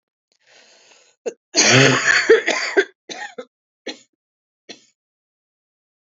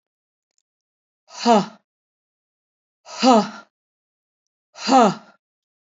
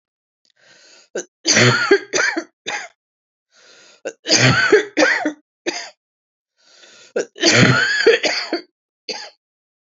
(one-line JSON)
{"cough_length": "6.1 s", "cough_amplitude": 31231, "cough_signal_mean_std_ratio": 0.35, "exhalation_length": "5.9 s", "exhalation_amplitude": 30749, "exhalation_signal_mean_std_ratio": 0.28, "three_cough_length": "10.0 s", "three_cough_amplitude": 31155, "three_cough_signal_mean_std_ratio": 0.46, "survey_phase": "beta (2021-08-13 to 2022-03-07)", "age": "45-64", "gender": "Female", "wearing_mask": "No", "symptom_cough_any": true, "symptom_new_continuous_cough": true, "symptom_runny_or_blocked_nose": true, "symptom_fatigue": true, "symptom_headache": true, "symptom_change_to_sense_of_smell_or_taste": true, "symptom_onset": "2 days", "smoker_status": "Never smoked", "respiratory_condition_asthma": false, "respiratory_condition_other": false, "recruitment_source": "Test and Trace", "submission_delay": "1 day", "covid_test_result": "Negative", "covid_test_method": "RT-qPCR"}